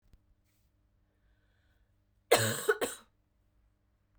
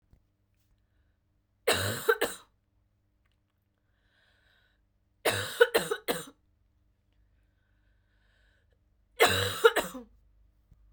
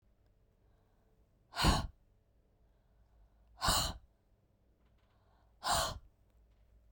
{"cough_length": "4.2 s", "cough_amplitude": 10985, "cough_signal_mean_std_ratio": 0.25, "three_cough_length": "10.9 s", "three_cough_amplitude": 17409, "three_cough_signal_mean_std_ratio": 0.28, "exhalation_length": "6.9 s", "exhalation_amplitude": 5173, "exhalation_signal_mean_std_ratio": 0.31, "survey_phase": "beta (2021-08-13 to 2022-03-07)", "age": "18-44", "gender": "Female", "wearing_mask": "No", "symptom_cough_any": true, "symptom_new_continuous_cough": true, "symptom_runny_or_blocked_nose": true, "symptom_shortness_of_breath": true, "symptom_sore_throat": true, "symptom_fatigue": true, "symptom_headache": true, "symptom_other": true, "symptom_onset": "5 days", "smoker_status": "Ex-smoker", "respiratory_condition_asthma": true, "respiratory_condition_other": false, "recruitment_source": "Test and Trace", "submission_delay": "2 days", "covid_test_result": "Positive", "covid_test_method": "ePCR"}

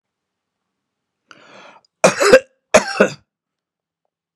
{"cough_length": "4.4 s", "cough_amplitude": 32768, "cough_signal_mean_std_ratio": 0.26, "survey_phase": "beta (2021-08-13 to 2022-03-07)", "age": "65+", "gender": "Male", "wearing_mask": "No", "symptom_none": true, "smoker_status": "Never smoked", "respiratory_condition_asthma": false, "respiratory_condition_other": false, "recruitment_source": "REACT", "submission_delay": "2 days", "covid_test_result": "Negative", "covid_test_method": "RT-qPCR"}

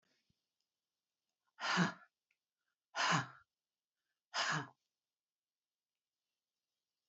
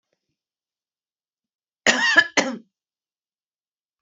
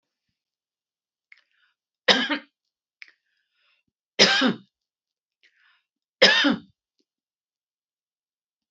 {"exhalation_length": "7.1 s", "exhalation_amplitude": 3293, "exhalation_signal_mean_std_ratio": 0.28, "cough_length": "4.0 s", "cough_amplitude": 27649, "cough_signal_mean_std_ratio": 0.27, "three_cough_length": "8.7 s", "three_cough_amplitude": 29139, "three_cough_signal_mean_std_ratio": 0.25, "survey_phase": "beta (2021-08-13 to 2022-03-07)", "age": "65+", "gender": "Female", "wearing_mask": "No", "symptom_none": true, "smoker_status": "Never smoked", "respiratory_condition_asthma": false, "respiratory_condition_other": false, "recruitment_source": "REACT", "submission_delay": "1 day", "covid_test_result": "Negative", "covid_test_method": "RT-qPCR"}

